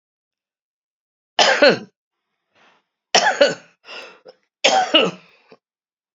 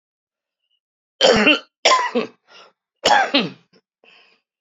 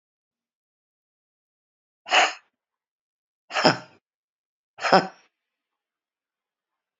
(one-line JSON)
{"three_cough_length": "6.1 s", "three_cough_amplitude": 32767, "three_cough_signal_mean_std_ratio": 0.35, "cough_length": "4.6 s", "cough_amplitude": 32410, "cough_signal_mean_std_ratio": 0.39, "exhalation_length": "7.0 s", "exhalation_amplitude": 28375, "exhalation_signal_mean_std_ratio": 0.21, "survey_phase": "beta (2021-08-13 to 2022-03-07)", "age": "65+", "gender": "Female", "wearing_mask": "No", "symptom_cough_any": true, "smoker_status": "Current smoker (1 to 10 cigarettes per day)", "respiratory_condition_asthma": false, "respiratory_condition_other": true, "recruitment_source": "REACT", "submission_delay": "2 days", "covid_test_result": "Negative", "covid_test_method": "RT-qPCR"}